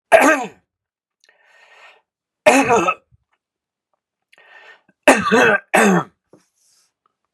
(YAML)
three_cough_length: 7.3 s
three_cough_amplitude: 32768
three_cough_signal_mean_std_ratio: 0.36
survey_phase: beta (2021-08-13 to 2022-03-07)
age: 45-64
gender: Male
wearing_mask: 'No'
symptom_none: true
smoker_status: Never smoked
respiratory_condition_asthma: false
respiratory_condition_other: false
recruitment_source: REACT
submission_delay: 0 days
covid_test_result: Negative
covid_test_method: RT-qPCR
influenza_a_test_result: Negative
influenza_b_test_result: Negative